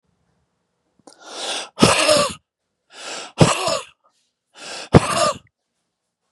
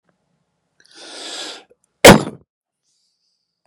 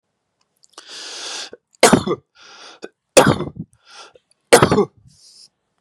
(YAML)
exhalation_length: 6.3 s
exhalation_amplitude: 32768
exhalation_signal_mean_std_ratio: 0.37
cough_length: 3.7 s
cough_amplitude: 32768
cough_signal_mean_std_ratio: 0.2
three_cough_length: 5.8 s
three_cough_amplitude: 32768
three_cough_signal_mean_std_ratio: 0.3
survey_phase: beta (2021-08-13 to 2022-03-07)
age: 45-64
gender: Male
wearing_mask: 'No'
symptom_none: true
smoker_status: Never smoked
respiratory_condition_asthma: false
respiratory_condition_other: false
recruitment_source: REACT
submission_delay: 0 days
covid_test_result: Negative
covid_test_method: RT-qPCR